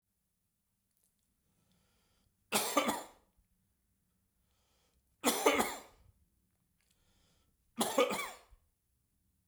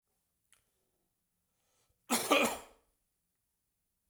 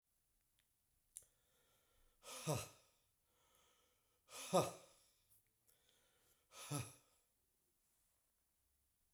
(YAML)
three_cough_length: 9.5 s
three_cough_amplitude: 7491
three_cough_signal_mean_std_ratio: 0.29
cough_length: 4.1 s
cough_amplitude: 6849
cough_signal_mean_std_ratio: 0.25
exhalation_length: 9.1 s
exhalation_amplitude: 2680
exhalation_signal_mean_std_ratio: 0.23
survey_phase: beta (2021-08-13 to 2022-03-07)
age: 45-64
gender: Male
wearing_mask: 'No'
symptom_none: true
smoker_status: Never smoked
respiratory_condition_asthma: false
respiratory_condition_other: false
recruitment_source: Test and Trace
submission_delay: 2 days
covid_test_result: Positive
covid_test_method: ePCR